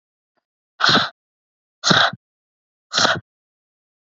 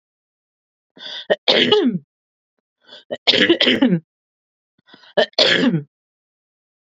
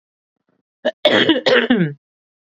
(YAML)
exhalation_length: 4.0 s
exhalation_amplitude: 31197
exhalation_signal_mean_std_ratio: 0.34
three_cough_length: 7.0 s
three_cough_amplitude: 32767
three_cough_signal_mean_std_ratio: 0.41
cough_length: 2.6 s
cough_amplitude: 32768
cough_signal_mean_std_ratio: 0.47
survey_phase: beta (2021-08-13 to 2022-03-07)
age: 18-44
gender: Female
wearing_mask: 'No'
symptom_none: true
smoker_status: Never smoked
respiratory_condition_asthma: true
respiratory_condition_other: false
recruitment_source: REACT
submission_delay: 3 days
covid_test_result: Negative
covid_test_method: RT-qPCR
influenza_a_test_result: Negative
influenza_b_test_result: Negative